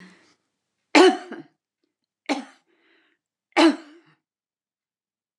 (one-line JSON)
{"three_cough_length": "5.4 s", "three_cough_amplitude": 29042, "three_cough_signal_mean_std_ratio": 0.24, "survey_phase": "beta (2021-08-13 to 2022-03-07)", "age": "65+", "gender": "Female", "wearing_mask": "No", "symptom_none": true, "smoker_status": "Ex-smoker", "respiratory_condition_asthma": false, "respiratory_condition_other": false, "recruitment_source": "REACT", "submission_delay": "1 day", "covid_test_result": "Negative", "covid_test_method": "RT-qPCR"}